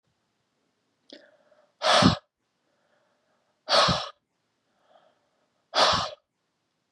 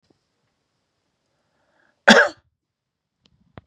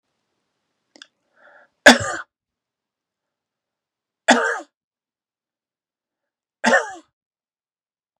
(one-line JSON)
{"exhalation_length": "6.9 s", "exhalation_amplitude": 19928, "exhalation_signal_mean_std_ratio": 0.3, "cough_length": "3.7 s", "cough_amplitude": 32768, "cough_signal_mean_std_ratio": 0.18, "three_cough_length": "8.2 s", "three_cough_amplitude": 32768, "three_cough_signal_mean_std_ratio": 0.2, "survey_phase": "beta (2021-08-13 to 2022-03-07)", "age": "45-64", "gender": "Male", "wearing_mask": "No", "symptom_none": true, "smoker_status": "Never smoked", "respiratory_condition_asthma": false, "respiratory_condition_other": false, "recruitment_source": "REACT", "submission_delay": "2 days", "covid_test_result": "Negative", "covid_test_method": "RT-qPCR"}